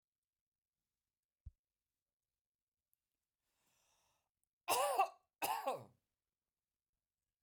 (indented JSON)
{
  "cough_length": "7.4 s",
  "cough_amplitude": 2603,
  "cough_signal_mean_std_ratio": 0.25,
  "survey_phase": "beta (2021-08-13 to 2022-03-07)",
  "age": "65+",
  "gender": "Female",
  "wearing_mask": "No",
  "symptom_none": true,
  "smoker_status": "Never smoked",
  "respiratory_condition_asthma": false,
  "respiratory_condition_other": false,
  "recruitment_source": "REACT",
  "submission_delay": "0 days",
  "covid_test_result": "Negative",
  "covid_test_method": "RT-qPCR"
}